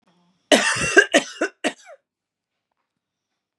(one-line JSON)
{"cough_length": "3.6 s", "cough_amplitude": 32751, "cough_signal_mean_std_ratio": 0.32, "survey_phase": "beta (2021-08-13 to 2022-03-07)", "age": "18-44", "gender": "Female", "wearing_mask": "No", "symptom_none": true, "smoker_status": "Ex-smoker", "respiratory_condition_asthma": false, "respiratory_condition_other": false, "recruitment_source": "REACT", "submission_delay": "1 day", "covid_test_result": "Negative", "covid_test_method": "RT-qPCR", "influenza_a_test_result": "Negative", "influenza_b_test_result": "Negative"}